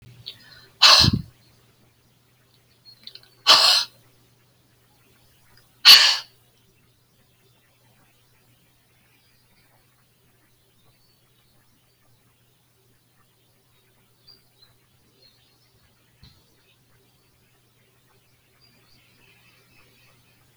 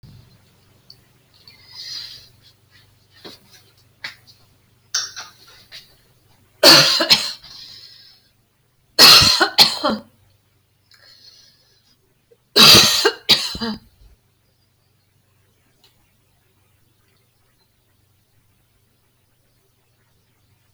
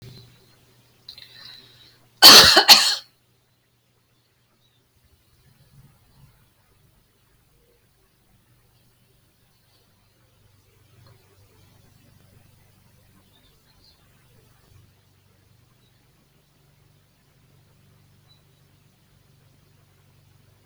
{"exhalation_length": "20.6 s", "exhalation_amplitude": 32767, "exhalation_signal_mean_std_ratio": 0.18, "three_cough_length": "20.7 s", "three_cough_amplitude": 32768, "three_cough_signal_mean_std_ratio": 0.26, "cough_length": "20.7 s", "cough_amplitude": 32768, "cough_signal_mean_std_ratio": 0.15, "survey_phase": "beta (2021-08-13 to 2022-03-07)", "age": "65+", "gender": "Female", "wearing_mask": "No", "symptom_none": true, "symptom_onset": "13 days", "smoker_status": "Ex-smoker", "respiratory_condition_asthma": false, "respiratory_condition_other": false, "recruitment_source": "REACT", "submission_delay": "4 days", "covid_test_result": "Negative", "covid_test_method": "RT-qPCR"}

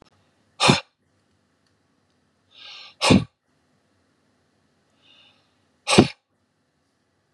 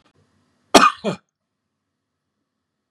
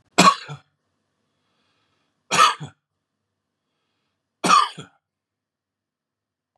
{"exhalation_length": "7.3 s", "exhalation_amplitude": 32768, "exhalation_signal_mean_std_ratio": 0.21, "cough_length": "2.9 s", "cough_amplitude": 32768, "cough_signal_mean_std_ratio": 0.21, "three_cough_length": "6.6 s", "three_cough_amplitude": 29878, "three_cough_signal_mean_std_ratio": 0.25, "survey_phase": "beta (2021-08-13 to 2022-03-07)", "age": "65+", "gender": "Male", "wearing_mask": "Yes", "symptom_none": true, "smoker_status": "Ex-smoker", "respiratory_condition_asthma": false, "respiratory_condition_other": false, "recruitment_source": "REACT", "submission_delay": "1 day", "covid_test_result": "Negative", "covid_test_method": "RT-qPCR", "influenza_a_test_result": "Negative", "influenza_b_test_result": "Negative"}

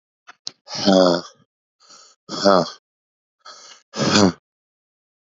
{"exhalation_length": "5.4 s", "exhalation_amplitude": 30223, "exhalation_signal_mean_std_ratio": 0.35, "survey_phase": "beta (2021-08-13 to 2022-03-07)", "age": "18-44", "gender": "Male", "wearing_mask": "No", "symptom_cough_any": true, "symptom_new_continuous_cough": true, "symptom_runny_or_blocked_nose": true, "symptom_shortness_of_breath": true, "symptom_sore_throat": true, "symptom_fatigue": true, "symptom_change_to_sense_of_smell_or_taste": true, "symptom_onset": "4 days", "smoker_status": "Never smoked", "respiratory_condition_asthma": false, "respiratory_condition_other": false, "recruitment_source": "Test and Trace", "submission_delay": "2 days", "covid_test_result": "Positive", "covid_test_method": "RT-qPCR"}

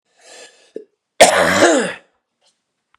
{"cough_length": "3.0 s", "cough_amplitude": 32768, "cough_signal_mean_std_ratio": 0.39, "survey_phase": "beta (2021-08-13 to 2022-03-07)", "age": "18-44", "gender": "Male", "wearing_mask": "No", "symptom_cough_any": true, "symptom_runny_or_blocked_nose": true, "symptom_sore_throat": true, "symptom_diarrhoea": true, "symptom_fatigue": true, "symptom_headache": true, "smoker_status": "Never smoked", "respiratory_condition_asthma": true, "respiratory_condition_other": false, "recruitment_source": "Test and Trace", "submission_delay": "2 days", "covid_test_result": "Positive", "covid_test_method": "RT-qPCR", "covid_ct_value": 21.6, "covid_ct_gene": "ORF1ab gene", "covid_ct_mean": 22.1, "covid_viral_load": "54000 copies/ml", "covid_viral_load_category": "Low viral load (10K-1M copies/ml)"}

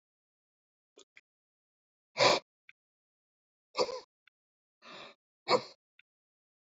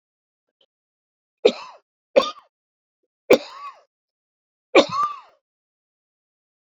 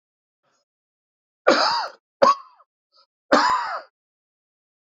{"exhalation_length": "6.7 s", "exhalation_amplitude": 8328, "exhalation_signal_mean_std_ratio": 0.21, "three_cough_length": "6.7 s", "three_cough_amplitude": 27688, "three_cough_signal_mean_std_ratio": 0.22, "cough_length": "4.9 s", "cough_amplitude": 27756, "cough_signal_mean_std_ratio": 0.34, "survey_phase": "beta (2021-08-13 to 2022-03-07)", "age": "45-64", "gender": "Male", "wearing_mask": "No", "symptom_none": true, "smoker_status": "Never smoked", "respiratory_condition_asthma": false, "respiratory_condition_other": false, "recruitment_source": "REACT", "submission_delay": "0 days", "covid_test_result": "Negative", "covid_test_method": "RT-qPCR"}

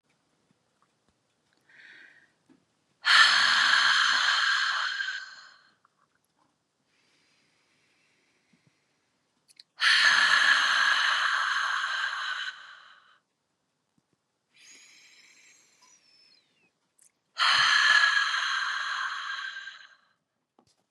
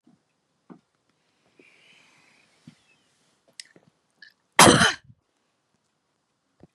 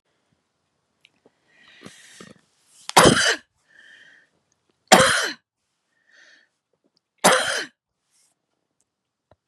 {"exhalation_length": "20.9 s", "exhalation_amplitude": 18304, "exhalation_signal_mean_std_ratio": 0.47, "cough_length": "6.7 s", "cough_amplitude": 30637, "cough_signal_mean_std_ratio": 0.17, "three_cough_length": "9.5 s", "three_cough_amplitude": 32768, "three_cough_signal_mean_std_ratio": 0.25, "survey_phase": "beta (2021-08-13 to 2022-03-07)", "age": "65+", "gender": "Female", "wearing_mask": "No", "symptom_none": true, "smoker_status": "Never smoked", "respiratory_condition_asthma": false, "respiratory_condition_other": false, "recruitment_source": "REACT", "submission_delay": "2 days", "covid_test_result": "Negative", "covid_test_method": "RT-qPCR", "influenza_a_test_result": "Negative", "influenza_b_test_result": "Negative"}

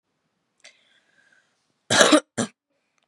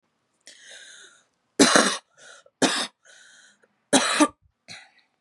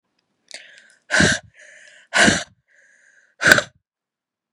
{"cough_length": "3.1 s", "cough_amplitude": 32768, "cough_signal_mean_std_ratio": 0.26, "three_cough_length": "5.2 s", "three_cough_amplitude": 31622, "three_cough_signal_mean_std_ratio": 0.33, "exhalation_length": "4.5 s", "exhalation_amplitude": 32768, "exhalation_signal_mean_std_ratio": 0.31, "survey_phase": "beta (2021-08-13 to 2022-03-07)", "age": "18-44", "gender": "Female", "wearing_mask": "Yes", "symptom_cough_any": true, "symptom_new_continuous_cough": true, "symptom_runny_or_blocked_nose": true, "symptom_sore_throat": true, "symptom_other": true, "symptom_onset": "4 days", "smoker_status": "Never smoked", "respiratory_condition_asthma": false, "respiratory_condition_other": false, "recruitment_source": "Test and Trace", "submission_delay": "2 days", "covid_test_result": "Positive", "covid_test_method": "RT-qPCR", "covid_ct_value": 16.8, "covid_ct_gene": "N gene"}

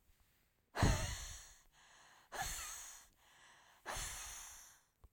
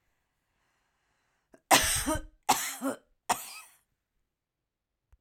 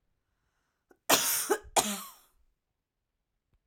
{"exhalation_length": "5.1 s", "exhalation_amplitude": 3208, "exhalation_signal_mean_std_ratio": 0.42, "three_cough_length": "5.2 s", "three_cough_amplitude": 18226, "three_cough_signal_mean_std_ratio": 0.31, "cough_length": "3.7 s", "cough_amplitude": 13793, "cough_signal_mean_std_ratio": 0.32, "survey_phase": "alpha (2021-03-01 to 2021-08-12)", "age": "45-64", "gender": "Female", "wearing_mask": "No", "symptom_none": true, "smoker_status": "Ex-smoker", "respiratory_condition_asthma": false, "respiratory_condition_other": false, "recruitment_source": "REACT", "submission_delay": "1 day", "covid_test_result": "Negative", "covid_test_method": "RT-qPCR"}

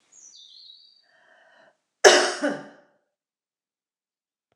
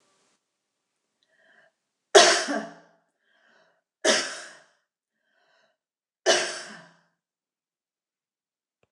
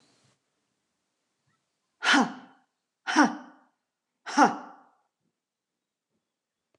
{"cough_length": "4.6 s", "cough_amplitude": 29204, "cough_signal_mean_std_ratio": 0.22, "three_cough_length": "8.9 s", "three_cough_amplitude": 29070, "three_cough_signal_mean_std_ratio": 0.23, "exhalation_length": "6.8 s", "exhalation_amplitude": 16774, "exhalation_signal_mean_std_ratio": 0.25, "survey_phase": "beta (2021-08-13 to 2022-03-07)", "age": "45-64", "gender": "Female", "wearing_mask": "No", "symptom_none": true, "smoker_status": "Never smoked", "respiratory_condition_asthma": false, "respiratory_condition_other": false, "recruitment_source": "REACT", "submission_delay": "4 days", "covid_test_result": "Negative", "covid_test_method": "RT-qPCR", "covid_ct_value": 46.0, "covid_ct_gene": "N gene"}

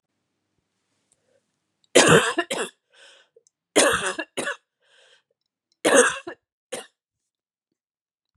{"three_cough_length": "8.4 s", "three_cough_amplitude": 32767, "three_cough_signal_mean_std_ratio": 0.3, "survey_phase": "beta (2021-08-13 to 2022-03-07)", "age": "18-44", "gender": "Female", "wearing_mask": "No", "symptom_cough_any": true, "symptom_runny_or_blocked_nose": true, "symptom_headache": true, "symptom_change_to_sense_of_smell_or_taste": true, "symptom_onset": "4 days", "smoker_status": "Never smoked", "respiratory_condition_asthma": false, "respiratory_condition_other": false, "recruitment_source": "Test and Trace", "submission_delay": "1 day", "covid_test_result": "Positive", "covid_test_method": "RT-qPCR", "covid_ct_value": 22.6, "covid_ct_gene": "N gene"}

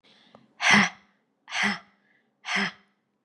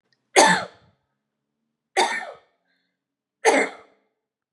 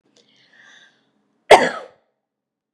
{"exhalation_length": "3.2 s", "exhalation_amplitude": 17125, "exhalation_signal_mean_std_ratio": 0.36, "three_cough_length": "4.5 s", "three_cough_amplitude": 32549, "three_cough_signal_mean_std_ratio": 0.31, "cough_length": "2.7 s", "cough_amplitude": 32768, "cough_signal_mean_std_ratio": 0.19, "survey_phase": "beta (2021-08-13 to 2022-03-07)", "age": "45-64", "gender": "Female", "wearing_mask": "No", "symptom_runny_or_blocked_nose": true, "symptom_shortness_of_breath": true, "smoker_status": "Never smoked", "respiratory_condition_asthma": true, "respiratory_condition_other": false, "recruitment_source": "REACT", "submission_delay": "1 day", "covid_test_result": "Negative", "covid_test_method": "RT-qPCR", "influenza_a_test_result": "Negative", "influenza_b_test_result": "Negative"}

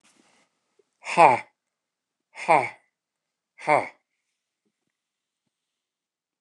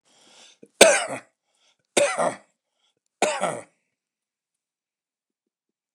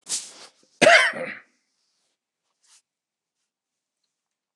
{"exhalation_length": "6.4 s", "exhalation_amplitude": 27222, "exhalation_signal_mean_std_ratio": 0.22, "three_cough_length": "5.9 s", "three_cough_amplitude": 29204, "three_cough_signal_mean_std_ratio": 0.27, "cough_length": "4.6 s", "cough_amplitude": 29203, "cough_signal_mean_std_ratio": 0.24, "survey_phase": "beta (2021-08-13 to 2022-03-07)", "age": "65+", "gender": "Male", "wearing_mask": "No", "symptom_none": true, "symptom_onset": "12 days", "smoker_status": "Ex-smoker", "respiratory_condition_asthma": false, "respiratory_condition_other": false, "recruitment_source": "REACT", "submission_delay": "2 days", "covid_test_result": "Negative", "covid_test_method": "RT-qPCR"}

